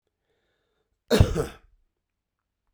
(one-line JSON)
{"cough_length": "2.7 s", "cough_amplitude": 28164, "cough_signal_mean_std_ratio": 0.23, "survey_phase": "beta (2021-08-13 to 2022-03-07)", "age": "45-64", "gender": "Male", "wearing_mask": "No", "symptom_none": true, "smoker_status": "Never smoked", "respiratory_condition_asthma": false, "respiratory_condition_other": false, "recruitment_source": "REACT", "submission_delay": "1 day", "covid_test_result": "Negative", "covid_test_method": "RT-qPCR"}